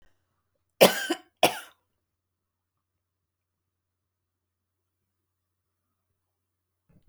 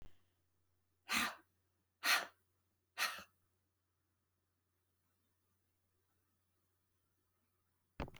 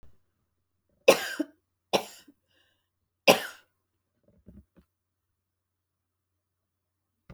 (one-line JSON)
{"cough_length": "7.1 s", "cough_amplitude": 24791, "cough_signal_mean_std_ratio": 0.15, "exhalation_length": "8.2 s", "exhalation_amplitude": 3251, "exhalation_signal_mean_std_ratio": 0.24, "three_cough_length": "7.3 s", "three_cough_amplitude": 23133, "three_cough_signal_mean_std_ratio": 0.17, "survey_phase": "beta (2021-08-13 to 2022-03-07)", "age": "65+", "gender": "Female", "wearing_mask": "No", "symptom_none": true, "smoker_status": "Never smoked", "respiratory_condition_asthma": false, "respiratory_condition_other": false, "recruitment_source": "REACT", "submission_delay": "1 day", "covid_test_result": "Negative", "covid_test_method": "RT-qPCR"}